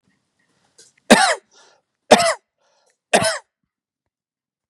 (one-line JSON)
{"three_cough_length": "4.7 s", "three_cough_amplitude": 32768, "three_cough_signal_mean_std_ratio": 0.27, "survey_phase": "beta (2021-08-13 to 2022-03-07)", "age": "65+", "gender": "Male", "wearing_mask": "No", "symptom_none": true, "smoker_status": "Ex-smoker", "respiratory_condition_asthma": false, "respiratory_condition_other": false, "recruitment_source": "REACT", "submission_delay": "5 days", "covid_test_result": "Negative", "covid_test_method": "RT-qPCR", "influenza_a_test_result": "Negative", "influenza_b_test_result": "Negative"}